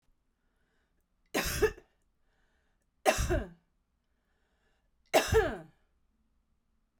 {
  "three_cough_length": "7.0 s",
  "three_cough_amplitude": 10524,
  "three_cough_signal_mean_std_ratio": 0.3,
  "survey_phase": "beta (2021-08-13 to 2022-03-07)",
  "age": "18-44",
  "gender": "Female",
  "wearing_mask": "No",
  "symptom_cough_any": true,
  "symptom_runny_or_blocked_nose": true,
  "symptom_fatigue": true,
  "symptom_onset": "8 days",
  "smoker_status": "Prefer not to say",
  "respiratory_condition_asthma": false,
  "respiratory_condition_other": false,
  "recruitment_source": "REACT",
  "submission_delay": "1 day",
  "covid_test_result": "Negative",
  "covid_test_method": "RT-qPCR"
}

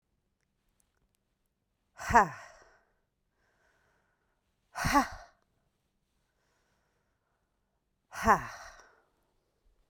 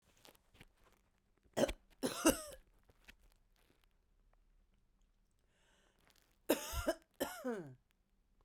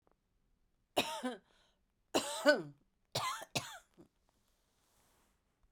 {
  "exhalation_length": "9.9 s",
  "exhalation_amplitude": 13561,
  "exhalation_signal_mean_std_ratio": 0.2,
  "cough_length": "8.4 s",
  "cough_amplitude": 5755,
  "cough_signal_mean_std_ratio": 0.28,
  "three_cough_length": "5.7 s",
  "three_cough_amplitude": 7460,
  "three_cough_signal_mean_std_ratio": 0.3,
  "survey_phase": "beta (2021-08-13 to 2022-03-07)",
  "age": "45-64",
  "gender": "Female",
  "wearing_mask": "No",
  "symptom_runny_or_blocked_nose": true,
  "symptom_change_to_sense_of_smell_or_taste": true,
  "symptom_onset": "2 days",
  "smoker_status": "Current smoker (11 or more cigarettes per day)",
  "respiratory_condition_asthma": false,
  "respiratory_condition_other": false,
  "recruitment_source": "Test and Trace",
  "submission_delay": "2 days",
  "covid_test_result": "Positive",
  "covid_test_method": "ePCR"
}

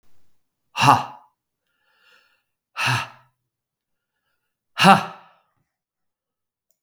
{
  "exhalation_length": "6.8 s",
  "exhalation_amplitude": 32766,
  "exhalation_signal_mean_std_ratio": 0.24,
  "survey_phase": "beta (2021-08-13 to 2022-03-07)",
  "age": "65+",
  "gender": "Male",
  "wearing_mask": "No",
  "symptom_none": true,
  "symptom_onset": "4 days",
  "smoker_status": "Never smoked",
  "respiratory_condition_asthma": false,
  "respiratory_condition_other": false,
  "recruitment_source": "REACT",
  "submission_delay": "1 day",
  "covid_test_result": "Negative",
  "covid_test_method": "RT-qPCR",
  "influenza_a_test_result": "Negative",
  "influenza_b_test_result": "Negative"
}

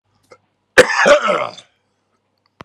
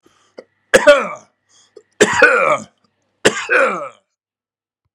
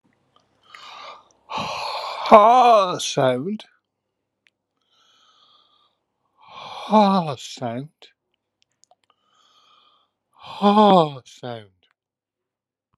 {
  "cough_length": "2.6 s",
  "cough_amplitude": 32768,
  "cough_signal_mean_std_ratio": 0.36,
  "three_cough_length": "4.9 s",
  "three_cough_amplitude": 32768,
  "three_cough_signal_mean_std_ratio": 0.4,
  "exhalation_length": "13.0 s",
  "exhalation_amplitude": 32768,
  "exhalation_signal_mean_std_ratio": 0.34,
  "survey_phase": "alpha (2021-03-01 to 2021-08-12)",
  "age": "45-64",
  "gender": "Male",
  "wearing_mask": "No",
  "symptom_none": true,
  "symptom_onset": "13 days",
  "smoker_status": "Ex-smoker",
  "respiratory_condition_asthma": false,
  "respiratory_condition_other": true,
  "recruitment_source": "REACT",
  "submission_delay": "4 days",
  "covid_test_result": "Negative",
  "covid_test_method": "RT-qPCR"
}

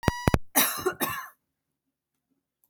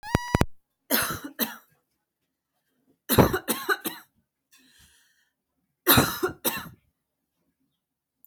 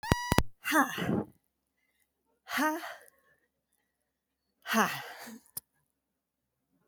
{
  "cough_length": "2.7 s",
  "cough_amplitude": 25015,
  "cough_signal_mean_std_ratio": 0.36,
  "three_cough_length": "8.3 s",
  "three_cough_amplitude": 25998,
  "three_cough_signal_mean_std_ratio": 0.32,
  "exhalation_length": "6.9 s",
  "exhalation_amplitude": 19378,
  "exhalation_signal_mean_std_ratio": 0.36,
  "survey_phase": "alpha (2021-03-01 to 2021-08-12)",
  "age": "18-44",
  "gender": "Female",
  "wearing_mask": "No",
  "symptom_fatigue": true,
  "symptom_headache": true,
  "symptom_onset": "3 days",
  "smoker_status": "Never smoked",
  "respiratory_condition_asthma": false,
  "respiratory_condition_other": false,
  "recruitment_source": "REACT",
  "submission_delay": "2 days",
  "covid_test_result": "Negative",
  "covid_test_method": "RT-qPCR"
}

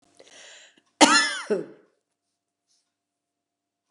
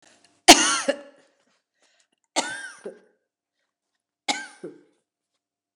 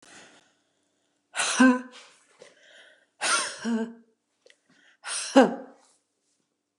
{
  "cough_length": "3.9 s",
  "cough_amplitude": 29056,
  "cough_signal_mean_std_ratio": 0.26,
  "three_cough_length": "5.8 s",
  "three_cough_amplitude": 31148,
  "three_cough_signal_mean_std_ratio": 0.21,
  "exhalation_length": "6.8 s",
  "exhalation_amplitude": 24155,
  "exhalation_signal_mean_std_ratio": 0.31,
  "survey_phase": "beta (2021-08-13 to 2022-03-07)",
  "age": "65+",
  "gender": "Female",
  "wearing_mask": "No",
  "symptom_none": true,
  "smoker_status": "Never smoked",
  "respiratory_condition_asthma": true,
  "respiratory_condition_other": false,
  "recruitment_source": "REACT",
  "submission_delay": "2 days",
  "covid_test_result": "Negative",
  "covid_test_method": "RT-qPCR"
}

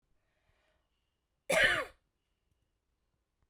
{
  "cough_length": "3.5 s",
  "cough_amplitude": 5845,
  "cough_signal_mean_std_ratio": 0.25,
  "survey_phase": "beta (2021-08-13 to 2022-03-07)",
  "age": "45-64",
  "gender": "Female",
  "wearing_mask": "No",
  "symptom_fatigue": true,
  "symptom_headache": true,
  "symptom_onset": "12 days",
  "smoker_status": "Never smoked",
  "respiratory_condition_asthma": true,
  "respiratory_condition_other": false,
  "recruitment_source": "REACT",
  "submission_delay": "1 day",
  "covid_test_result": "Negative",
  "covid_test_method": "RT-qPCR"
}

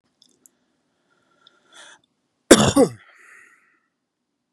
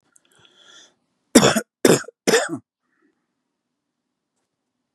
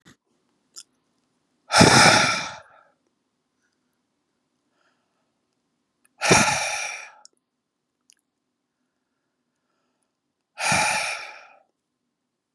{
  "cough_length": "4.5 s",
  "cough_amplitude": 32768,
  "cough_signal_mean_std_ratio": 0.21,
  "three_cough_length": "4.9 s",
  "three_cough_amplitude": 32768,
  "three_cough_signal_mean_std_ratio": 0.26,
  "exhalation_length": "12.5 s",
  "exhalation_amplitude": 31502,
  "exhalation_signal_mean_std_ratio": 0.29,
  "survey_phase": "beta (2021-08-13 to 2022-03-07)",
  "age": "18-44",
  "gender": "Male",
  "wearing_mask": "No",
  "symptom_none": true,
  "smoker_status": "Never smoked",
  "respiratory_condition_asthma": true,
  "respiratory_condition_other": false,
  "recruitment_source": "REACT",
  "submission_delay": "0 days",
  "covid_test_result": "Negative",
  "covid_test_method": "RT-qPCR",
  "influenza_a_test_result": "Negative",
  "influenza_b_test_result": "Negative"
}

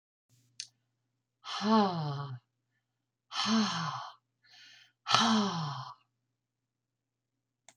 {
  "exhalation_length": "7.8 s",
  "exhalation_amplitude": 22710,
  "exhalation_signal_mean_std_ratio": 0.42,
  "survey_phase": "alpha (2021-03-01 to 2021-08-12)",
  "age": "65+",
  "gender": "Female",
  "wearing_mask": "No",
  "symptom_none": true,
  "smoker_status": "Never smoked",
  "respiratory_condition_asthma": false,
  "respiratory_condition_other": false,
  "recruitment_source": "REACT",
  "submission_delay": "1 day",
  "covid_test_result": "Negative",
  "covid_test_method": "RT-qPCR"
}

